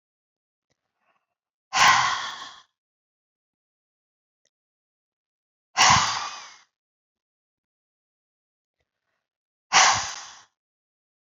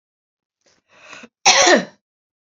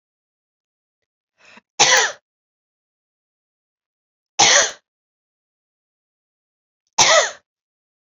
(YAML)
exhalation_length: 11.3 s
exhalation_amplitude: 24178
exhalation_signal_mean_std_ratio: 0.27
cough_length: 2.6 s
cough_amplitude: 32768
cough_signal_mean_std_ratio: 0.32
three_cough_length: 8.1 s
three_cough_amplitude: 32768
three_cough_signal_mean_std_ratio: 0.26
survey_phase: beta (2021-08-13 to 2022-03-07)
age: 45-64
gender: Female
wearing_mask: 'No'
symptom_runny_or_blocked_nose: true
symptom_fatigue: true
symptom_headache: true
smoker_status: Never smoked
respiratory_condition_asthma: false
respiratory_condition_other: false
recruitment_source: REACT
submission_delay: 0 days
covid_test_result: Positive
covid_test_method: RT-qPCR
covid_ct_value: 22.0
covid_ct_gene: E gene
influenza_a_test_result: Negative
influenza_b_test_result: Negative